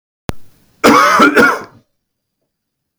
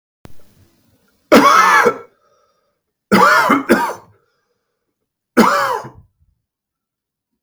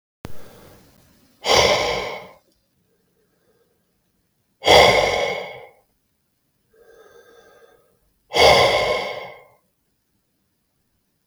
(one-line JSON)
{"cough_length": "3.0 s", "cough_amplitude": 32768, "cough_signal_mean_std_ratio": 0.45, "three_cough_length": "7.4 s", "three_cough_amplitude": 32768, "three_cough_signal_mean_std_ratio": 0.41, "exhalation_length": "11.3 s", "exhalation_amplitude": 32768, "exhalation_signal_mean_std_ratio": 0.35, "survey_phase": "beta (2021-08-13 to 2022-03-07)", "age": "18-44", "gender": "Male", "wearing_mask": "No", "symptom_other": true, "smoker_status": "Never smoked", "respiratory_condition_asthma": false, "respiratory_condition_other": false, "recruitment_source": "REACT", "submission_delay": "11 days", "covid_test_result": "Negative", "covid_test_method": "RT-qPCR", "influenza_a_test_result": "Negative", "influenza_b_test_result": "Negative"}